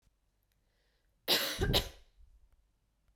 {"cough_length": "3.2 s", "cough_amplitude": 5477, "cough_signal_mean_std_ratio": 0.34, "survey_phase": "beta (2021-08-13 to 2022-03-07)", "age": "18-44", "gender": "Female", "wearing_mask": "No", "symptom_runny_or_blocked_nose": true, "symptom_sore_throat": true, "smoker_status": "Never smoked", "respiratory_condition_asthma": false, "respiratory_condition_other": false, "recruitment_source": "Test and Trace", "submission_delay": "2 days", "covid_test_result": "Positive", "covid_test_method": "RT-qPCR", "covid_ct_value": 20.3, "covid_ct_gene": "ORF1ab gene"}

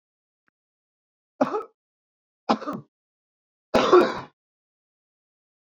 {"three_cough_length": "5.7 s", "three_cough_amplitude": 21985, "three_cough_signal_mean_std_ratio": 0.26, "survey_phase": "beta (2021-08-13 to 2022-03-07)", "age": "45-64", "gender": "Male", "wearing_mask": "No", "symptom_cough_any": true, "symptom_runny_or_blocked_nose": true, "symptom_onset": "3 days", "smoker_status": "Never smoked", "respiratory_condition_asthma": false, "respiratory_condition_other": false, "recruitment_source": "Test and Trace", "submission_delay": "1 day", "covid_test_result": "Positive", "covid_test_method": "RT-qPCR", "covid_ct_value": 22.2, "covid_ct_gene": "ORF1ab gene", "covid_ct_mean": 23.0, "covid_viral_load": "29000 copies/ml", "covid_viral_load_category": "Low viral load (10K-1M copies/ml)"}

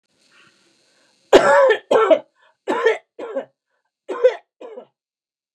{"three_cough_length": "5.5 s", "three_cough_amplitude": 29204, "three_cough_signal_mean_std_ratio": 0.38, "survey_phase": "beta (2021-08-13 to 2022-03-07)", "age": "65+", "gender": "Female", "wearing_mask": "No", "symptom_none": true, "smoker_status": "Never smoked", "respiratory_condition_asthma": false, "respiratory_condition_other": false, "recruitment_source": "REACT", "submission_delay": "2 days", "covid_test_result": "Negative", "covid_test_method": "RT-qPCR", "influenza_a_test_result": "Negative", "influenza_b_test_result": "Negative"}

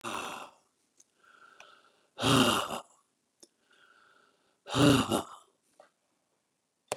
{"exhalation_length": "7.0 s", "exhalation_amplitude": 9524, "exhalation_signal_mean_std_ratio": 0.32, "survey_phase": "beta (2021-08-13 to 2022-03-07)", "age": "65+", "gender": "Male", "wearing_mask": "No", "symptom_none": true, "smoker_status": "Ex-smoker", "respiratory_condition_asthma": false, "respiratory_condition_other": false, "recruitment_source": "REACT", "submission_delay": "3 days", "covid_test_result": "Negative", "covid_test_method": "RT-qPCR", "influenza_a_test_result": "Negative", "influenza_b_test_result": "Negative"}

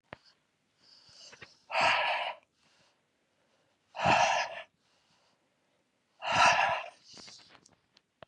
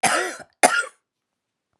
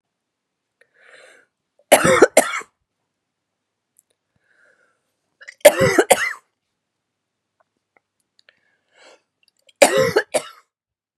{"exhalation_length": "8.3 s", "exhalation_amplitude": 10058, "exhalation_signal_mean_std_ratio": 0.38, "cough_length": "1.8 s", "cough_amplitude": 31876, "cough_signal_mean_std_ratio": 0.39, "three_cough_length": "11.2 s", "three_cough_amplitude": 32768, "three_cough_signal_mean_std_ratio": 0.25, "survey_phase": "beta (2021-08-13 to 2022-03-07)", "age": "45-64", "gender": "Female", "wearing_mask": "No", "symptom_cough_any": true, "symptom_runny_or_blocked_nose": true, "symptom_diarrhoea": true, "symptom_fatigue": true, "symptom_fever_high_temperature": true, "symptom_headache": true, "symptom_change_to_sense_of_smell_or_taste": true, "smoker_status": "Current smoker (e-cigarettes or vapes only)", "respiratory_condition_asthma": false, "respiratory_condition_other": false, "recruitment_source": "Test and Trace", "submission_delay": "2 days", "covid_test_result": "Positive", "covid_test_method": "RT-qPCR", "covid_ct_value": 20.9, "covid_ct_gene": "N gene", "covid_ct_mean": 21.1, "covid_viral_load": "120000 copies/ml", "covid_viral_load_category": "Low viral load (10K-1M copies/ml)"}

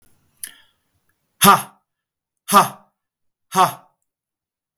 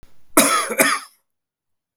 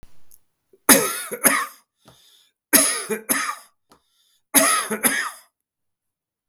{"exhalation_length": "4.8 s", "exhalation_amplitude": 32768, "exhalation_signal_mean_std_ratio": 0.25, "cough_length": "2.0 s", "cough_amplitude": 32768, "cough_signal_mean_std_ratio": 0.44, "three_cough_length": "6.5 s", "three_cough_amplitude": 32768, "three_cough_signal_mean_std_ratio": 0.4, "survey_phase": "beta (2021-08-13 to 2022-03-07)", "age": "45-64", "gender": "Male", "wearing_mask": "No", "symptom_none": true, "smoker_status": "Never smoked", "respiratory_condition_asthma": false, "respiratory_condition_other": false, "recruitment_source": "REACT", "submission_delay": "1 day", "covid_test_result": "Negative", "covid_test_method": "RT-qPCR", "influenza_a_test_result": "Negative", "influenza_b_test_result": "Negative"}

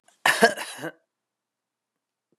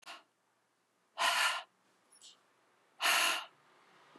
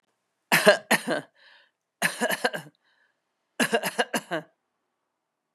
{"cough_length": "2.4 s", "cough_amplitude": 29805, "cough_signal_mean_std_ratio": 0.26, "exhalation_length": "4.2 s", "exhalation_amplitude": 5272, "exhalation_signal_mean_std_ratio": 0.39, "three_cough_length": "5.5 s", "three_cough_amplitude": 31558, "three_cough_signal_mean_std_ratio": 0.34, "survey_phase": "beta (2021-08-13 to 2022-03-07)", "age": "65+", "gender": "Female", "wearing_mask": "No", "symptom_runny_or_blocked_nose": true, "symptom_sore_throat": true, "symptom_onset": "5 days", "smoker_status": "Ex-smoker", "respiratory_condition_asthma": false, "respiratory_condition_other": false, "recruitment_source": "Test and Trace", "submission_delay": "2 days", "covid_test_result": "Positive", "covid_test_method": "RT-qPCR", "covid_ct_value": 21.1, "covid_ct_gene": "ORF1ab gene"}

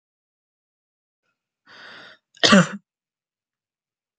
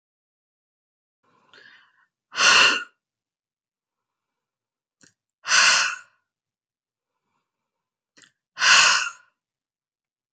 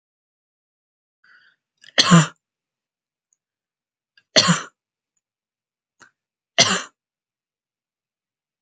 {"cough_length": "4.2 s", "cough_amplitude": 29157, "cough_signal_mean_std_ratio": 0.19, "exhalation_length": "10.3 s", "exhalation_amplitude": 25747, "exhalation_signal_mean_std_ratio": 0.29, "three_cough_length": "8.6 s", "three_cough_amplitude": 32529, "three_cough_signal_mean_std_ratio": 0.21, "survey_phase": "beta (2021-08-13 to 2022-03-07)", "age": "18-44", "gender": "Female", "wearing_mask": "No", "symptom_none": true, "symptom_onset": "9 days", "smoker_status": "Never smoked", "respiratory_condition_asthma": true, "respiratory_condition_other": false, "recruitment_source": "REACT", "submission_delay": "1 day", "covid_test_result": "Negative", "covid_test_method": "RT-qPCR"}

